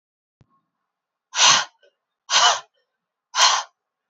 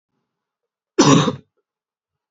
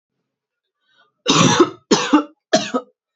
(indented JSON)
{
  "exhalation_length": "4.1 s",
  "exhalation_amplitude": 29259,
  "exhalation_signal_mean_std_ratio": 0.35,
  "cough_length": "2.3 s",
  "cough_amplitude": 29694,
  "cough_signal_mean_std_ratio": 0.3,
  "three_cough_length": "3.2 s",
  "three_cough_amplitude": 30134,
  "three_cough_signal_mean_std_ratio": 0.42,
  "survey_phase": "beta (2021-08-13 to 2022-03-07)",
  "age": "18-44",
  "gender": "Female",
  "wearing_mask": "No",
  "symptom_none": true,
  "smoker_status": "Never smoked",
  "respiratory_condition_asthma": true,
  "respiratory_condition_other": false,
  "recruitment_source": "REACT",
  "submission_delay": "1 day",
  "covid_test_result": "Negative",
  "covid_test_method": "RT-qPCR"
}